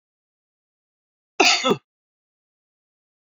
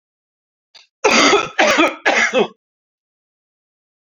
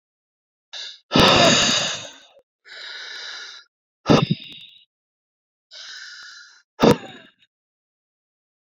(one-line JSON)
{"cough_length": "3.3 s", "cough_amplitude": 27583, "cough_signal_mean_std_ratio": 0.24, "three_cough_length": "4.0 s", "three_cough_amplitude": 29311, "three_cough_signal_mean_std_ratio": 0.45, "exhalation_length": "8.6 s", "exhalation_amplitude": 27459, "exhalation_signal_mean_std_ratio": 0.34, "survey_phase": "beta (2021-08-13 to 2022-03-07)", "age": "45-64", "gender": "Male", "wearing_mask": "No", "symptom_runny_or_blocked_nose": true, "symptom_sore_throat": true, "smoker_status": "Never smoked", "respiratory_condition_asthma": false, "respiratory_condition_other": false, "recruitment_source": "REACT", "submission_delay": "2 days", "covid_test_result": "Negative", "covid_test_method": "RT-qPCR"}